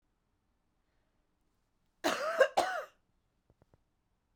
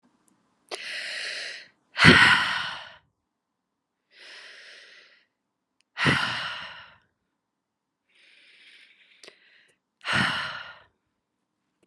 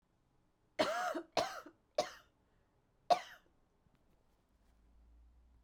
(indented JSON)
{
  "cough_length": "4.4 s",
  "cough_amplitude": 8383,
  "cough_signal_mean_std_ratio": 0.28,
  "exhalation_length": "11.9 s",
  "exhalation_amplitude": 30936,
  "exhalation_signal_mean_std_ratio": 0.3,
  "three_cough_length": "5.6 s",
  "three_cough_amplitude": 4602,
  "three_cough_signal_mean_std_ratio": 0.29,
  "survey_phase": "beta (2021-08-13 to 2022-03-07)",
  "age": "18-44",
  "gender": "Female",
  "wearing_mask": "No",
  "symptom_cough_any": true,
  "symptom_runny_or_blocked_nose": true,
  "symptom_fatigue": true,
  "smoker_status": "Ex-smoker",
  "respiratory_condition_asthma": false,
  "respiratory_condition_other": false,
  "recruitment_source": "Test and Trace",
  "submission_delay": "1 day",
  "covid_test_result": "Positive",
  "covid_test_method": "LFT"
}